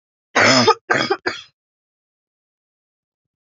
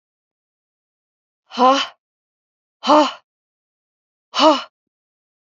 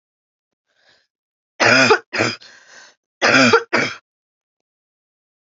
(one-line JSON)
{"cough_length": "3.4 s", "cough_amplitude": 28569, "cough_signal_mean_std_ratio": 0.35, "exhalation_length": "5.5 s", "exhalation_amplitude": 28258, "exhalation_signal_mean_std_ratio": 0.28, "three_cough_length": "5.5 s", "three_cough_amplitude": 32768, "three_cough_signal_mean_std_ratio": 0.36, "survey_phase": "beta (2021-08-13 to 2022-03-07)", "age": "18-44", "gender": "Female", "wearing_mask": "No", "symptom_none": true, "smoker_status": "Never smoked", "respiratory_condition_asthma": true, "respiratory_condition_other": false, "recruitment_source": "REACT", "submission_delay": "35 days", "covid_test_result": "Negative", "covid_test_method": "RT-qPCR", "influenza_a_test_result": "Unknown/Void", "influenza_b_test_result": "Unknown/Void"}